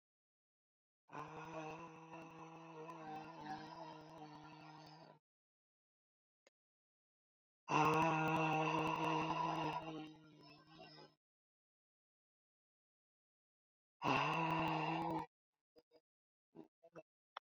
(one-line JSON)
{"exhalation_length": "17.6 s", "exhalation_amplitude": 2809, "exhalation_signal_mean_std_ratio": 0.44, "survey_phase": "beta (2021-08-13 to 2022-03-07)", "age": "45-64", "gender": "Female", "wearing_mask": "No", "symptom_cough_any": true, "symptom_runny_or_blocked_nose": true, "symptom_sore_throat": true, "symptom_abdominal_pain": true, "symptom_headache": true, "symptom_change_to_sense_of_smell_or_taste": true, "symptom_loss_of_taste": true, "symptom_onset": "3 days", "smoker_status": "Never smoked", "respiratory_condition_asthma": false, "respiratory_condition_other": false, "recruitment_source": "Test and Trace", "submission_delay": "2 days", "covid_test_result": "Positive", "covid_test_method": "RT-qPCR", "covid_ct_value": 16.9, "covid_ct_gene": "N gene", "covid_ct_mean": 17.8, "covid_viral_load": "1400000 copies/ml", "covid_viral_load_category": "High viral load (>1M copies/ml)"}